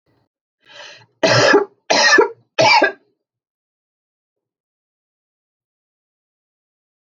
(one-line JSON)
{"three_cough_length": "7.1 s", "three_cough_amplitude": 28692, "three_cough_signal_mean_std_ratio": 0.33, "survey_phase": "beta (2021-08-13 to 2022-03-07)", "age": "65+", "gender": "Female", "wearing_mask": "No", "symptom_none": true, "smoker_status": "Never smoked", "respiratory_condition_asthma": false, "respiratory_condition_other": false, "recruitment_source": "REACT", "submission_delay": "2 days", "covid_test_result": "Negative", "covid_test_method": "RT-qPCR"}